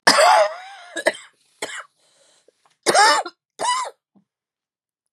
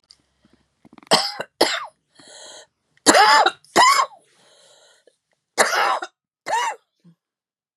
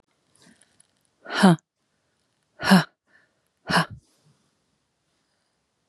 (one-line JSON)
{"cough_length": "5.1 s", "cough_amplitude": 32768, "cough_signal_mean_std_ratio": 0.4, "three_cough_length": "7.8 s", "three_cough_amplitude": 32768, "three_cough_signal_mean_std_ratio": 0.38, "exhalation_length": "5.9 s", "exhalation_amplitude": 27915, "exhalation_signal_mean_std_ratio": 0.24, "survey_phase": "beta (2021-08-13 to 2022-03-07)", "age": "45-64", "gender": "Female", "wearing_mask": "No", "symptom_cough_any": true, "symptom_runny_or_blocked_nose": true, "symptom_fatigue": true, "symptom_fever_high_temperature": true, "symptom_headache": true, "symptom_onset": "5 days", "smoker_status": "Never smoked", "respiratory_condition_asthma": true, "respiratory_condition_other": false, "recruitment_source": "Test and Trace", "submission_delay": "1 day", "covid_test_result": "Negative", "covid_test_method": "ePCR"}